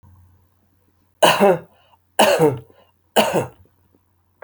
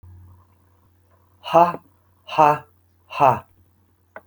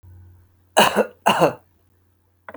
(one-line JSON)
{"three_cough_length": "4.4 s", "three_cough_amplitude": 31872, "three_cough_signal_mean_std_ratio": 0.38, "exhalation_length": "4.3 s", "exhalation_amplitude": 27275, "exhalation_signal_mean_std_ratio": 0.3, "cough_length": "2.6 s", "cough_amplitude": 31178, "cough_signal_mean_std_ratio": 0.36, "survey_phase": "alpha (2021-03-01 to 2021-08-12)", "age": "65+", "gender": "Male", "wearing_mask": "No", "symptom_none": true, "smoker_status": "Never smoked", "respiratory_condition_asthma": false, "respiratory_condition_other": false, "recruitment_source": "REACT", "submission_delay": "3 days", "covid_test_result": "Negative", "covid_test_method": "RT-qPCR"}